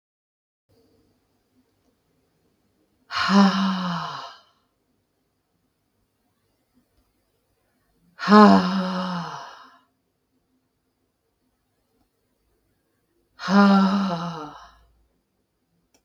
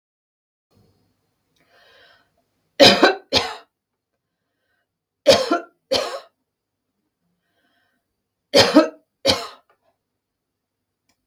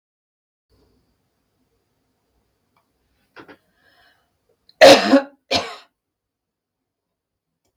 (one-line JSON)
{"exhalation_length": "16.0 s", "exhalation_amplitude": 31129, "exhalation_signal_mean_std_ratio": 0.31, "three_cough_length": "11.3 s", "three_cough_amplitude": 32768, "three_cough_signal_mean_std_ratio": 0.26, "cough_length": "7.8 s", "cough_amplitude": 32767, "cough_signal_mean_std_ratio": 0.19, "survey_phase": "beta (2021-08-13 to 2022-03-07)", "age": "45-64", "gender": "Female", "wearing_mask": "No", "symptom_none": true, "smoker_status": "Ex-smoker", "respiratory_condition_asthma": false, "respiratory_condition_other": false, "recruitment_source": "REACT", "submission_delay": "2 days", "covid_test_result": "Negative", "covid_test_method": "RT-qPCR", "influenza_a_test_result": "Negative", "influenza_b_test_result": "Negative"}